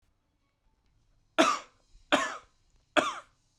{"three_cough_length": "3.6 s", "three_cough_amplitude": 13655, "three_cough_signal_mean_std_ratio": 0.3, "survey_phase": "beta (2021-08-13 to 2022-03-07)", "age": "18-44", "gender": "Male", "wearing_mask": "No", "symptom_none": true, "smoker_status": "Current smoker (e-cigarettes or vapes only)", "respiratory_condition_asthma": false, "respiratory_condition_other": false, "recruitment_source": "REACT", "submission_delay": "1 day", "covid_test_result": "Negative", "covid_test_method": "RT-qPCR"}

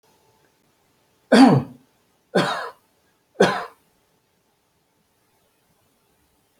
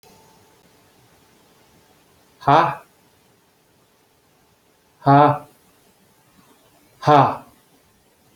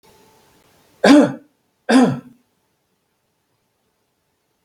{"three_cough_length": "6.6 s", "three_cough_amplitude": 27205, "three_cough_signal_mean_std_ratio": 0.26, "exhalation_length": "8.4 s", "exhalation_amplitude": 32767, "exhalation_signal_mean_std_ratio": 0.26, "cough_length": "4.6 s", "cough_amplitude": 31867, "cough_signal_mean_std_ratio": 0.28, "survey_phase": "alpha (2021-03-01 to 2021-08-12)", "age": "45-64", "gender": "Male", "wearing_mask": "No", "symptom_none": true, "smoker_status": "Never smoked", "respiratory_condition_asthma": false, "respiratory_condition_other": false, "recruitment_source": "REACT", "submission_delay": "1 day", "covid_test_result": "Negative", "covid_test_method": "RT-qPCR"}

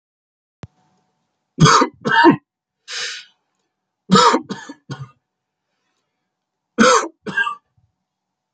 {"three_cough_length": "8.5 s", "three_cough_amplitude": 32712, "three_cough_signal_mean_std_ratio": 0.34, "survey_phase": "beta (2021-08-13 to 2022-03-07)", "age": "45-64", "gender": "Male", "wearing_mask": "No", "symptom_other": true, "symptom_onset": "7 days", "smoker_status": "Ex-smoker", "respiratory_condition_asthma": false, "respiratory_condition_other": false, "recruitment_source": "Test and Trace", "submission_delay": "2 days", "covid_test_result": "Positive", "covid_test_method": "RT-qPCR"}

